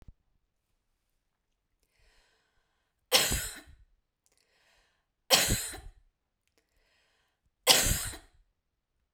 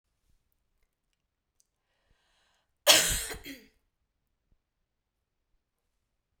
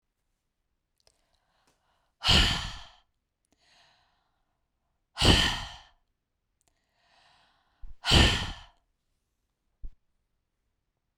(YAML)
three_cough_length: 9.1 s
three_cough_amplitude: 20670
three_cough_signal_mean_std_ratio: 0.26
cough_length: 6.4 s
cough_amplitude: 17989
cough_signal_mean_std_ratio: 0.18
exhalation_length: 11.2 s
exhalation_amplitude: 19298
exhalation_signal_mean_std_ratio: 0.27
survey_phase: beta (2021-08-13 to 2022-03-07)
age: 45-64
gender: Female
wearing_mask: 'No'
symptom_none: true
smoker_status: Never smoked
respiratory_condition_asthma: true
respiratory_condition_other: false
recruitment_source: Test and Trace
submission_delay: 1 day
covid_test_result: Negative
covid_test_method: LFT